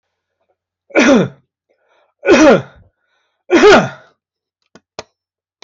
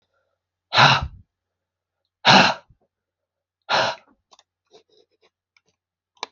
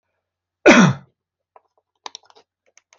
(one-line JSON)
{"three_cough_length": "5.6 s", "three_cough_amplitude": 30584, "three_cough_signal_mean_std_ratio": 0.37, "exhalation_length": "6.3 s", "exhalation_amplitude": 29661, "exhalation_signal_mean_std_ratio": 0.27, "cough_length": "3.0 s", "cough_amplitude": 28286, "cough_signal_mean_std_ratio": 0.25, "survey_phase": "alpha (2021-03-01 to 2021-08-12)", "age": "65+", "gender": "Male", "wearing_mask": "No", "symptom_none": true, "smoker_status": "Never smoked", "respiratory_condition_asthma": false, "respiratory_condition_other": false, "recruitment_source": "REACT", "submission_delay": "2 days", "covid_test_result": "Negative", "covid_test_method": "RT-qPCR"}